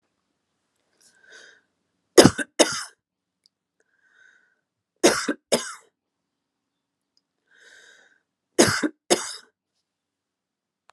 {
  "three_cough_length": "10.9 s",
  "three_cough_amplitude": 32768,
  "three_cough_signal_mean_std_ratio": 0.21,
  "survey_phase": "alpha (2021-03-01 to 2021-08-12)",
  "age": "65+",
  "gender": "Female",
  "wearing_mask": "No",
  "symptom_none": true,
  "smoker_status": "Never smoked",
  "respiratory_condition_asthma": false,
  "respiratory_condition_other": false,
  "recruitment_source": "REACT",
  "submission_delay": "2 days",
  "covid_test_result": "Negative",
  "covid_test_method": "RT-qPCR"
}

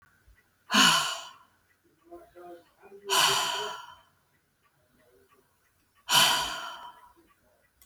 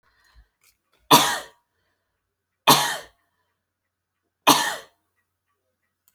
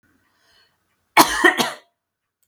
{
  "exhalation_length": "7.9 s",
  "exhalation_amplitude": 14327,
  "exhalation_signal_mean_std_ratio": 0.37,
  "three_cough_length": "6.1 s",
  "three_cough_amplitude": 32767,
  "three_cough_signal_mean_std_ratio": 0.25,
  "cough_length": "2.5 s",
  "cough_amplitude": 32489,
  "cough_signal_mean_std_ratio": 0.3,
  "survey_phase": "beta (2021-08-13 to 2022-03-07)",
  "age": "45-64",
  "gender": "Female",
  "wearing_mask": "No",
  "symptom_none": true,
  "smoker_status": "Never smoked",
  "respiratory_condition_asthma": false,
  "respiratory_condition_other": false,
  "recruitment_source": "REACT",
  "submission_delay": "7 days",
  "covid_test_result": "Negative",
  "covid_test_method": "RT-qPCR"
}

